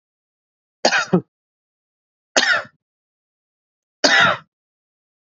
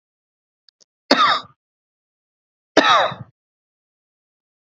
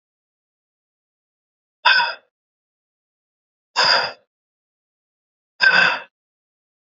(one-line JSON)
{"three_cough_length": "5.3 s", "three_cough_amplitude": 32767, "three_cough_signal_mean_std_ratio": 0.31, "cough_length": "4.6 s", "cough_amplitude": 32768, "cough_signal_mean_std_ratio": 0.29, "exhalation_length": "6.8 s", "exhalation_amplitude": 27895, "exhalation_signal_mean_std_ratio": 0.29, "survey_phase": "beta (2021-08-13 to 2022-03-07)", "age": "18-44", "gender": "Male", "wearing_mask": "No", "symptom_shortness_of_breath": true, "symptom_fatigue": true, "symptom_headache": true, "symptom_other": true, "smoker_status": "Never smoked", "respiratory_condition_asthma": false, "respiratory_condition_other": false, "recruitment_source": "Test and Trace", "submission_delay": "1 day", "covid_test_result": "Positive", "covid_test_method": "RT-qPCR", "covid_ct_value": 27.2, "covid_ct_gene": "ORF1ab gene"}